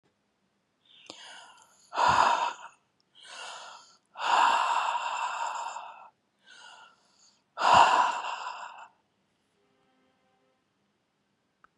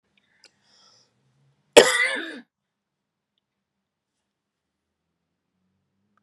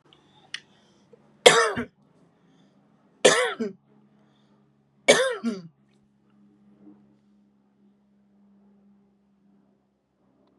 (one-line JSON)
{"exhalation_length": "11.8 s", "exhalation_amplitude": 16146, "exhalation_signal_mean_std_ratio": 0.4, "cough_length": "6.2 s", "cough_amplitude": 32768, "cough_signal_mean_std_ratio": 0.16, "three_cough_length": "10.6 s", "three_cough_amplitude": 32768, "three_cough_signal_mean_std_ratio": 0.23, "survey_phase": "beta (2021-08-13 to 2022-03-07)", "age": "65+", "gender": "Female", "wearing_mask": "No", "symptom_none": true, "smoker_status": "Never smoked", "respiratory_condition_asthma": false, "respiratory_condition_other": false, "recruitment_source": "REACT", "submission_delay": "4 days", "covid_test_result": "Negative", "covid_test_method": "RT-qPCR", "influenza_a_test_result": "Negative", "influenza_b_test_result": "Negative"}